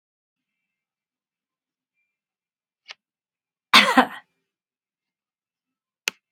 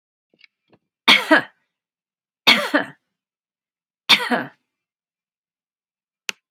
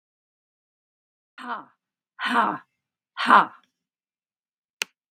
{"cough_length": "6.3 s", "cough_amplitude": 32768, "cough_signal_mean_std_ratio": 0.16, "three_cough_length": "6.5 s", "three_cough_amplitude": 32768, "three_cough_signal_mean_std_ratio": 0.26, "exhalation_length": "5.1 s", "exhalation_amplitude": 30583, "exhalation_signal_mean_std_ratio": 0.24, "survey_phase": "beta (2021-08-13 to 2022-03-07)", "age": "65+", "gender": "Female", "wearing_mask": "No", "symptom_runny_or_blocked_nose": true, "smoker_status": "Never smoked", "respiratory_condition_asthma": false, "respiratory_condition_other": false, "recruitment_source": "REACT", "submission_delay": "10 days", "covid_test_result": "Negative", "covid_test_method": "RT-qPCR", "influenza_a_test_result": "Negative", "influenza_b_test_result": "Negative"}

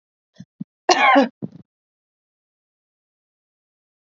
{"cough_length": "4.1 s", "cough_amplitude": 32768, "cough_signal_mean_std_ratio": 0.25, "survey_phase": "beta (2021-08-13 to 2022-03-07)", "age": "45-64", "gender": "Female", "wearing_mask": "No", "symptom_none": true, "smoker_status": "Never smoked", "respiratory_condition_asthma": false, "respiratory_condition_other": false, "recruitment_source": "REACT", "submission_delay": "3 days", "covid_test_result": "Negative", "covid_test_method": "RT-qPCR", "influenza_a_test_result": "Unknown/Void", "influenza_b_test_result": "Unknown/Void"}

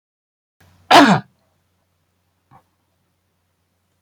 {"cough_length": "4.0 s", "cough_amplitude": 32767, "cough_signal_mean_std_ratio": 0.22, "survey_phase": "beta (2021-08-13 to 2022-03-07)", "age": "65+", "gender": "Male", "wearing_mask": "No", "symptom_none": true, "smoker_status": "Never smoked", "respiratory_condition_asthma": false, "respiratory_condition_other": false, "recruitment_source": "REACT", "submission_delay": "2 days", "covid_test_result": "Negative", "covid_test_method": "RT-qPCR"}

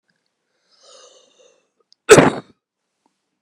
{"cough_length": "3.4 s", "cough_amplitude": 32768, "cough_signal_mean_std_ratio": 0.2, "survey_phase": "beta (2021-08-13 to 2022-03-07)", "age": "45-64", "gender": "Female", "wearing_mask": "No", "symptom_cough_any": true, "symptom_runny_or_blocked_nose": true, "symptom_fatigue": true, "symptom_fever_high_temperature": true, "symptom_headache": true, "symptom_onset": "2 days", "smoker_status": "Never smoked", "respiratory_condition_asthma": false, "respiratory_condition_other": false, "recruitment_source": "Test and Trace", "submission_delay": "2 days", "covid_test_result": "Positive", "covid_test_method": "RT-qPCR", "covid_ct_value": 25.9, "covid_ct_gene": "S gene", "covid_ct_mean": 26.3, "covid_viral_load": "2300 copies/ml", "covid_viral_load_category": "Minimal viral load (< 10K copies/ml)"}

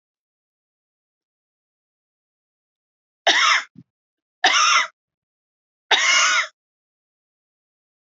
{"three_cough_length": "8.1 s", "three_cough_amplitude": 23648, "three_cough_signal_mean_std_ratio": 0.33, "survey_phase": "alpha (2021-03-01 to 2021-08-12)", "age": "45-64", "gender": "Female", "wearing_mask": "No", "symptom_none": true, "smoker_status": "Never smoked", "respiratory_condition_asthma": true, "respiratory_condition_other": false, "recruitment_source": "REACT", "submission_delay": "1 day", "covid_test_result": "Negative", "covid_test_method": "RT-qPCR"}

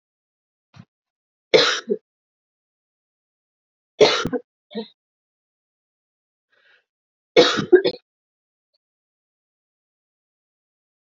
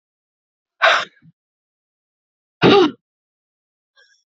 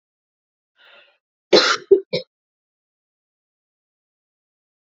{"three_cough_length": "11.1 s", "three_cough_amplitude": 27997, "three_cough_signal_mean_std_ratio": 0.22, "exhalation_length": "4.4 s", "exhalation_amplitude": 29672, "exhalation_signal_mean_std_ratio": 0.27, "cough_length": "4.9 s", "cough_amplitude": 29847, "cough_signal_mean_std_ratio": 0.2, "survey_phase": "beta (2021-08-13 to 2022-03-07)", "age": "18-44", "gender": "Female", "wearing_mask": "No", "symptom_cough_any": true, "symptom_runny_or_blocked_nose": true, "symptom_sore_throat": true, "symptom_fatigue": true, "symptom_headache": true, "symptom_change_to_sense_of_smell_or_taste": true, "symptom_loss_of_taste": true, "symptom_onset": "5 days", "smoker_status": "Ex-smoker", "respiratory_condition_asthma": false, "respiratory_condition_other": false, "recruitment_source": "Test and Trace", "submission_delay": "2 days", "covid_test_method": "RT-qPCR", "covid_ct_value": 33.1, "covid_ct_gene": "N gene"}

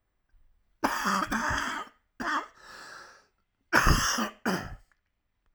{"cough_length": "5.5 s", "cough_amplitude": 14269, "cough_signal_mean_std_ratio": 0.48, "survey_phase": "alpha (2021-03-01 to 2021-08-12)", "age": "45-64", "gender": "Male", "wearing_mask": "No", "symptom_cough_any": true, "symptom_onset": "2 days", "smoker_status": "Never smoked", "respiratory_condition_asthma": false, "respiratory_condition_other": false, "recruitment_source": "Test and Trace", "submission_delay": "1 day", "covid_test_result": "Positive", "covid_test_method": "RT-qPCR", "covid_ct_value": 16.5, "covid_ct_gene": "ORF1ab gene", "covid_ct_mean": 16.9, "covid_viral_load": "2800000 copies/ml", "covid_viral_load_category": "High viral load (>1M copies/ml)"}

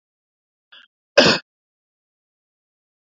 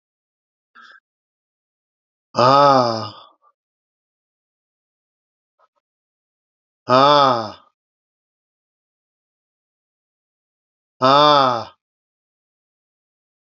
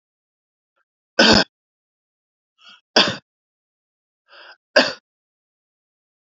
{"cough_length": "3.2 s", "cough_amplitude": 28202, "cough_signal_mean_std_ratio": 0.19, "exhalation_length": "13.6 s", "exhalation_amplitude": 31090, "exhalation_signal_mean_std_ratio": 0.27, "three_cough_length": "6.3 s", "three_cough_amplitude": 32767, "three_cough_signal_mean_std_ratio": 0.22, "survey_phase": "beta (2021-08-13 to 2022-03-07)", "age": "45-64", "gender": "Male", "wearing_mask": "No", "symptom_abdominal_pain": true, "smoker_status": "Current smoker (e-cigarettes or vapes only)", "respiratory_condition_asthma": false, "respiratory_condition_other": false, "recruitment_source": "Test and Trace", "submission_delay": "2 days", "covid_test_result": "Positive", "covid_test_method": "RT-qPCR", "covid_ct_value": 38.1, "covid_ct_gene": "N gene"}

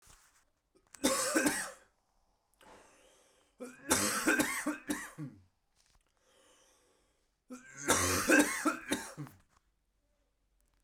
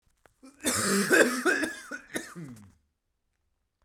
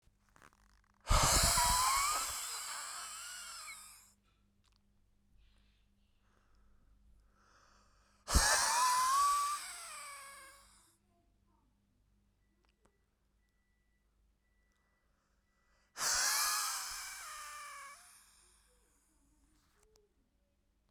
{"three_cough_length": "10.8 s", "three_cough_amplitude": 8436, "three_cough_signal_mean_std_ratio": 0.41, "cough_length": "3.8 s", "cough_amplitude": 12552, "cough_signal_mean_std_ratio": 0.46, "exhalation_length": "20.9 s", "exhalation_amplitude": 6284, "exhalation_signal_mean_std_ratio": 0.4, "survey_phase": "beta (2021-08-13 to 2022-03-07)", "age": "18-44", "gender": "Male", "wearing_mask": "No", "symptom_cough_any": true, "symptom_sore_throat": true, "symptom_fatigue": true, "symptom_onset": "2 days", "smoker_status": "Never smoked", "respiratory_condition_asthma": false, "respiratory_condition_other": false, "recruitment_source": "Test and Trace", "submission_delay": "2 days", "covid_test_result": "Positive", "covid_test_method": "ePCR"}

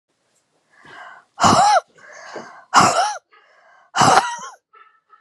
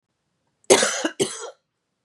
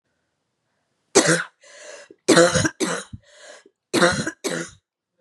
{"exhalation_length": "5.2 s", "exhalation_amplitude": 32768, "exhalation_signal_mean_std_ratio": 0.41, "cough_length": "2.0 s", "cough_amplitude": 31857, "cough_signal_mean_std_ratio": 0.35, "three_cough_length": "5.2 s", "three_cough_amplitude": 30361, "three_cough_signal_mean_std_ratio": 0.39, "survey_phase": "beta (2021-08-13 to 2022-03-07)", "age": "18-44", "gender": "Female", "wearing_mask": "No", "symptom_cough_any": true, "symptom_runny_or_blocked_nose": true, "symptom_sore_throat": true, "symptom_fatigue": true, "symptom_headache": true, "smoker_status": "Never smoked", "respiratory_condition_asthma": false, "respiratory_condition_other": false, "recruitment_source": "Test and Trace", "submission_delay": "1 day", "covid_test_result": "Positive", "covid_test_method": "LFT"}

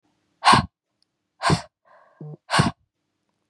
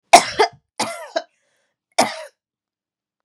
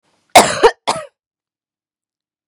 {"exhalation_length": "3.5 s", "exhalation_amplitude": 27946, "exhalation_signal_mean_std_ratio": 0.31, "three_cough_length": "3.2 s", "three_cough_amplitude": 32768, "three_cough_signal_mean_std_ratio": 0.27, "cough_length": "2.5 s", "cough_amplitude": 32768, "cough_signal_mean_std_ratio": 0.28, "survey_phase": "beta (2021-08-13 to 2022-03-07)", "age": "18-44", "gender": "Female", "wearing_mask": "No", "symptom_none": true, "smoker_status": "Never smoked", "respiratory_condition_asthma": false, "respiratory_condition_other": false, "recruitment_source": "REACT", "submission_delay": "2 days", "covid_test_result": "Negative", "covid_test_method": "RT-qPCR"}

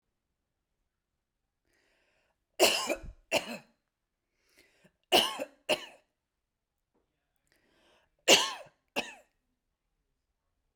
{"three_cough_length": "10.8 s", "three_cough_amplitude": 14634, "three_cough_signal_mean_std_ratio": 0.24, "survey_phase": "beta (2021-08-13 to 2022-03-07)", "age": "45-64", "gender": "Female", "wearing_mask": "No", "symptom_none": true, "symptom_onset": "12 days", "smoker_status": "Never smoked", "respiratory_condition_asthma": false, "respiratory_condition_other": false, "recruitment_source": "REACT", "submission_delay": "2 days", "covid_test_result": "Negative", "covid_test_method": "RT-qPCR"}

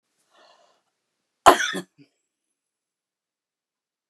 {"cough_length": "4.1 s", "cough_amplitude": 32768, "cough_signal_mean_std_ratio": 0.16, "survey_phase": "beta (2021-08-13 to 2022-03-07)", "age": "65+", "gender": "Female", "wearing_mask": "No", "symptom_shortness_of_breath": true, "smoker_status": "Ex-smoker", "respiratory_condition_asthma": false, "respiratory_condition_other": false, "recruitment_source": "REACT", "submission_delay": "1 day", "covid_test_result": "Negative", "covid_test_method": "RT-qPCR", "influenza_a_test_result": "Negative", "influenza_b_test_result": "Negative"}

